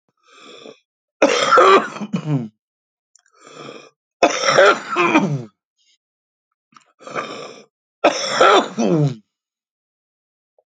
{
  "three_cough_length": "10.7 s",
  "three_cough_amplitude": 31593,
  "three_cough_signal_mean_std_ratio": 0.42,
  "survey_phase": "alpha (2021-03-01 to 2021-08-12)",
  "age": "45-64",
  "gender": "Male",
  "wearing_mask": "No",
  "symptom_shortness_of_breath": true,
  "smoker_status": "Ex-smoker",
  "respiratory_condition_asthma": true,
  "respiratory_condition_other": true,
  "recruitment_source": "REACT",
  "submission_delay": "2 days",
  "covid_test_result": "Negative",
  "covid_test_method": "RT-qPCR"
}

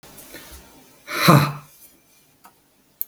{
  "exhalation_length": "3.1 s",
  "exhalation_amplitude": 32768,
  "exhalation_signal_mean_std_ratio": 0.3,
  "survey_phase": "beta (2021-08-13 to 2022-03-07)",
  "age": "45-64",
  "gender": "Male",
  "wearing_mask": "No",
  "symptom_sore_throat": true,
  "symptom_fatigue": true,
  "symptom_headache": true,
  "symptom_onset": "5 days",
  "smoker_status": "Ex-smoker",
  "respiratory_condition_asthma": false,
  "respiratory_condition_other": false,
  "recruitment_source": "REACT",
  "submission_delay": "0 days",
  "covid_test_result": "Positive",
  "covid_test_method": "RT-qPCR",
  "covid_ct_value": 27.2,
  "covid_ct_gene": "E gene",
  "influenza_a_test_result": "Negative",
  "influenza_b_test_result": "Negative"
}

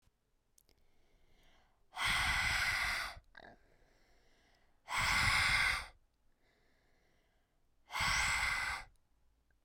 {
  "exhalation_length": "9.6 s",
  "exhalation_amplitude": 3647,
  "exhalation_signal_mean_std_ratio": 0.5,
  "survey_phase": "beta (2021-08-13 to 2022-03-07)",
  "age": "18-44",
  "gender": "Female",
  "wearing_mask": "No",
  "symptom_none": true,
  "smoker_status": "Never smoked",
  "respiratory_condition_asthma": false,
  "respiratory_condition_other": false,
  "recruitment_source": "REACT",
  "submission_delay": "2 days",
  "covid_test_result": "Negative",
  "covid_test_method": "RT-qPCR"
}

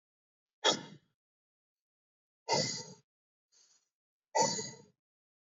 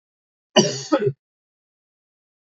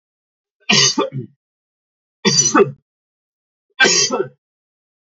{
  "exhalation_length": "5.5 s",
  "exhalation_amplitude": 5949,
  "exhalation_signal_mean_std_ratio": 0.29,
  "cough_length": "2.5 s",
  "cough_amplitude": 30619,
  "cough_signal_mean_std_ratio": 0.29,
  "three_cough_length": "5.1 s",
  "three_cough_amplitude": 31051,
  "three_cough_signal_mean_std_ratio": 0.39,
  "survey_phase": "alpha (2021-03-01 to 2021-08-12)",
  "age": "18-44",
  "gender": "Male",
  "wearing_mask": "No",
  "symptom_none": true,
  "smoker_status": "Never smoked",
  "respiratory_condition_asthma": false,
  "respiratory_condition_other": false,
  "recruitment_source": "Test and Trace",
  "submission_delay": "0 days",
  "covid_test_result": "Negative",
  "covid_test_method": "LFT"
}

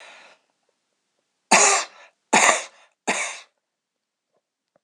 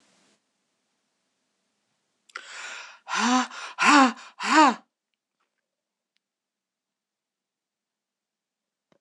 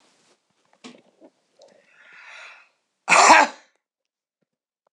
{
  "three_cough_length": "4.8 s",
  "three_cough_amplitude": 26028,
  "three_cough_signal_mean_std_ratio": 0.32,
  "exhalation_length": "9.0 s",
  "exhalation_amplitude": 19356,
  "exhalation_signal_mean_std_ratio": 0.27,
  "cough_length": "4.9 s",
  "cough_amplitude": 26028,
  "cough_signal_mean_std_ratio": 0.24,
  "survey_phase": "beta (2021-08-13 to 2022-03-07)",
  "age": "65+",
  "gender": "Female",
  "wearing_mask": "No",
  "symptom_none": true,
  "smoker_status": "Current smoker (1 to 10 cigarettes per day)",
  "respiratory_condition_asthma": false,
  "respiratory_condition_other": false,
  "recruitment_source": "REACT",
  "submission_delay": "3 days",
  "covid_test_result": "Negative",
  "covid_test_method": "RT-qPCR",
  "influenza_a_test_result": "Unknown/Void",
  "influenza_b_test_result": "Unknown/Void"
}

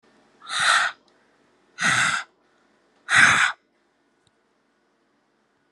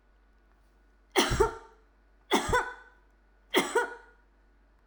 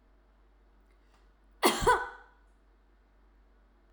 {
  "exhalation_length": "5.7 s",
  "exhalation_amplitude": 28669,
  "exhalation_signal_mean_std_ratio": 0.37,
  "three_cough_length": "4.9 s",
  "three_cough_amplitude": 10347,
  "three_cough_signal_mean_std_ratio": 0.38,
  "cough_length": "3.9 s",
  "cough_amplitude": 9837,
  "cough_signal_mean_std_ratio": 0.27,
  "survey_phase": "alpha (2021-03-01 to 2021-08-12)",
  "age": "45-64",
  "gender": "Female",
  "wearing_mask": "No",
  "symptom_none": true,
  "smoker_status": "Never smoked",
  "respiratory_condition_asthma": false,
  "respiratory_condition_other": false,
  "recruitment_source": "REACT",
  "submission_delay": "2 days",
  "covid_test_result": "Negative",
  "covid_test_method": "RT-qPCR"
}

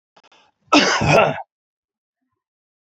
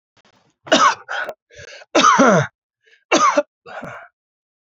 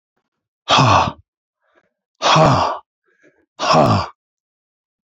{
  "cough_length": "2.8 s",
  "cough_amplitude": 27655,
  "cough_signal_mean_std_ratio": 0.38,
  "three_cough_length": "4.6 s",
  "three_cough_amplitude": 30476,
  "three_cough_signal_mean_std_ratio": 0.43,
  "exhalation_length": "5.0 s",
  "exhalation_amplitude": 29516,
  "exhalation_signal_mean_std_ratio": 0.44,
  "survey_phase": "beta (2021-08-13 to 2022-03-07)",
  "age": "45-64",
  "gender": "Male",
  "wearing_mask": "No",
  "symptom_none": true,
  "smoker_status": "Never smoked",
  "respiratory_condition_asthma": true,
  "respiratory_condition_other": true,
  "recruitment_source": "REACT",
  "submission_delay": "2 days",
  "covid_test_result": "Negative",
  "covid_test_method": "RT-qPCR",
  "influenza_a_test_result": "Negative",
  "influenza_b_test_result": "Negative"
}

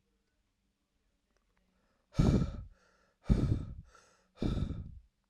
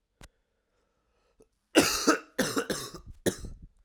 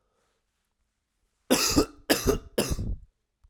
{
  "exhalation_length": "5.3 s",
  "exhalation_amplitude": 6641,
  "exhalation_signal_mean_std_ratio": 0.36,
  "cough_length": "3.8 s",
  "cough_amplitude": 16101,
  "cough_signal_mean_std_ratio": 0.37,
  "three_cough_length": "3.5 s",
  "three_cough_amplitude": 16930,
  "three_cough_signal_mean_std_ratio": 0.41,
  "survey_phase": "alpha (2021-03-01 to 2021-08-12)",
  "age": "18-44",
  "gender": "Male",
  "wearing_mask": "No",
  "symptom_cough_any": true,
  "symptom_abdominal_pain": true,
  "symptom_onset": "4 days",
  "smoker_status": "Never smoked",
  "respiratory_condition_asthma": false,
  "respiratory_condition_other": false,
  "recruitment_source": "Test and Trace",
  "submission_delay": "3 days",
  "covid_test_result": "Positive",
  "covid_test_method": "RT-qPCR"
}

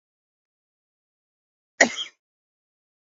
{
  "cough_length": "3.2 s",
  "cough_amplitude": 31394,
  "cough_signal_mean_std_ratio": 0.14,
  "survey_phase": "beta (2021-08-13 to 2022-03-07)",
  "age": "45-64",
  "gender": "Male",
  "wearing_mask": "No",
  "symptom_none": true,
  "symptom_onset": "12 days",
  "smoker_status": "Never smoked",
  "respiratory_condition_asthma": true,
  "respiratory_condition_other": false,
  "recruitment_source": "REACT",
  "submission_delay": "3 days",
  "covid_test_result": "Negative",
  "covid_test_method": "RT-qPCR",
  "influenza_a_test_result": "Negative",
  "influenza_b_test_result": "Negative"
}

